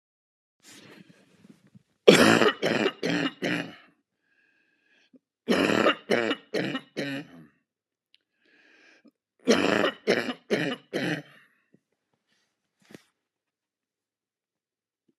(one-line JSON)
{"three_cough_length": "15.2 s", "three_cough_amplitude": 32375, "three_cough_signal_mean_std_ratio": 0.34, "survey_phase": "alpha (2021-03-01 to 2021-08-12)", "age": "65+", "gender": "Male", "wearing_mask": "No", "symptom_none": true, "smoker_status": "Ex-smoker", "respiratory_condition_asthma": false, "respiratory_condition_other": true, "recruitment_source": "REACT", "submission_delay": "2 days", "covid_test_result": "Negative", "covid_test_method": "RT-qPCR"}